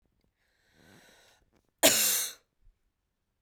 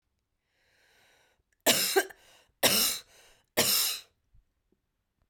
{"cough_length": "3.4 s", "cough_amplitude": 14392, "cough_signal_mean_std_ratio": 0.28, "three_cough_length": "5.3 s", "three_cough_amplitude": 11585, "three_cough_signal_mean_std_ratio": 0.37, "survey_phase": "beta (2021-08-13 to 2022-03-07)", "age": "18-44", "gender": "Female", "wearing_mask": "No", "symptom_cough_any": true, "symptom_runny_or_blocked_nose": true, "symptom_onset": "11 days", "smoker_status": "Never smoked", "respiratory_condition_asthma": false, "respiratory_condition_other": false, "recruitment_source": "REACT", "submission_delay": "7 days", "covid_test_result": "Negative", "covid_test_method": "RT-qPCR"}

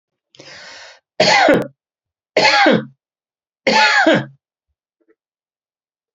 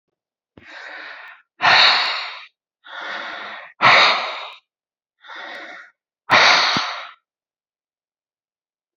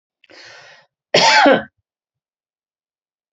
{"three_cough_length": "6.1 s", "three_cough_amplitude": 31465, "three_cough_signal_mean_std_ratio": 0.42, "exhalation_length": "9.0 s", "exhalation_amplitude": 30243, "exhalation_signal_mean_std_ratio": 0.4, "cough_length": "3.3 s", "cough_amplitude": 32767, "cough_signal_mean_std_ratio": 0.32, "survey_phase": "beta (2021-08-13 to 2022-03-07)", "age": "65+", "gender": "Male", "wearing_mask": "No", "symptom_none": true, "smoker_status": "Ex-smoker", "respiratory_condition_asthma": false, "respiratory_condition_other": false, "recruitment_source": "REACT", "submission_delay": "1 day", "covid_test_result": "Negative", "covid_test_method": "RT-qPCR"}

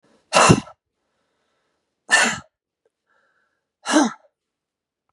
{"exhalation_length": "5.1 s", "exhalation_amplitude": 32768, "exhalation_signal_mean_std_ratio": 0.29, "survey_phase": "beta (2021-08-13 to 2022-03-07)", "age": "45-64", "gender": "Female", "wearing_mask": "No", "symptom_cough_any": true, "symptom_runny_or_blocked_nose": true, "symptom_fatigue": true, "symptom_change_to_sense_of_smell_or_taste": true, "symptom_onset": "3 days", "smoker_status": "Ex-smoker", "respiratory_condition_asthma": true, "respiratory_condition_other": false, "recruitment_source": "Test and Trace", "submission_delay": "2 days", "covid_test_result": "Positive", "covid_test_method": "RT-qPCR", "covid_ct_value": 12.9, "covid_ct_gene": "ORF1ab gene"}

